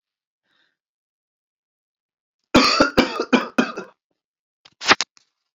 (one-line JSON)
{"three_cough_length": "5.5 s", "three_cough_amplitude": 32768, "three_cough_signal_mean_std_ratio": 0.3, "survey_phase": "beta (2021-08-13 to 2022-03-07)", "age": "45-64", "gender": "Male", "wearing_mask": "No", "symptom_cough_any": true, "symptom_sore_throat": true, "symptom_fever_high_temperature": true, "symptom_headache": true, "symptom_onset": "3 days", "smoker_status": "Never smoked", "respiratory_condition_asthma": false, "respiratory_condition_other": false, "recruitment_source": "Test and Trace", "submission_delay": "2 days", "covid_test_result": "Positive", "covid_test_method": "ePCR"}